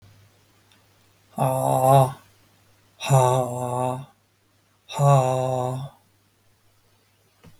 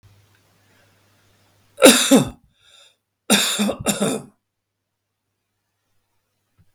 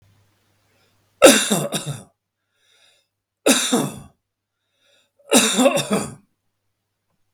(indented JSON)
{
  "exhalation_length": "7.6 s",
  "exhalation_amplitude": 20589,
  "exhalation_signal_mean_std_ratio": 0.43,
  "cough_length": "6.7 s",
  "cough_amplitude": 32768,
  "cough_signal_mean_std_ratio": 0.29,
  "three_cough_length": "7.3 s",
  "three_cough_amplitude": 32768,
  "three_cough_signal_mean_std_ratio": 0.34,
  "survey_phase": "beta (2021-08-13 to 2022-03-07)",
  "age": "45-64",
  "gender": "Male",
  "wearing_mask": "No",
  "symptom_none": true,
  "smoker_status": "Ex-smoker",
  "respiratory_condition_asthma": false,
  "respiratory_condition_other": false,
  "recruitment_source": "REACT",
  "submission_delay": "5 days",
  "covid_test_result": "Negative",
  "covid_test_method": "RT-qPCR",
  "influenza_a_test_result": "Negative",
  "influenza_b_test_result": "Negative"
}